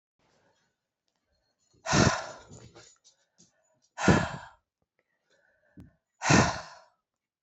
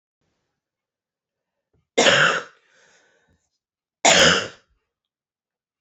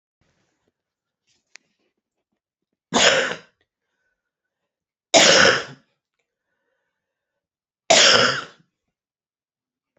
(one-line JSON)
{"exhalation_length": "7.4 s", "exhalation_amplitude": 13317, "exhalation_signal_mean_std_ratio": 0.28, "cough_length": "5.8 s", "cough_amplitude": 27617, "cough_signal_mean_std_ratio": 0.3, "three_cough_length": "10.0 s", "three_cough_amplitude": 32768, "three_cough_signal_mean_std_ratio": 0.29, "survey_phase": "beta (2021-08-13 to 2022-03-07)", "age": "45-64", "gender": "Female", "wearing_mask": "No", "symptom_cough_any": true, "symptom_runny_or_blocked_nose": true, "symptom_abdominal_pain": true, "symptom_headache": true, "symptom_loss_of_taste": true, "symptom_onset": "3 days", "smoker_status": "Current smoker (e-cigarettes or vapes only)", "respiratory_condition_asthma": true, "respiratory_condition_other": false, "recruitment_source": "Test and Trace", "submission_delay": "2 days", "covid_test_result": "Positive", "covid_test_method": "RT-qPCR", "covid_ct_value": 16.5, "covid_ct_gene": "ORF1ab gene", "covid_ct_mean": 17.0, "covid_viral_load": "2700000 copies/ml", "covid_viral_load_category": "High viral load (>1M copies/ml)"}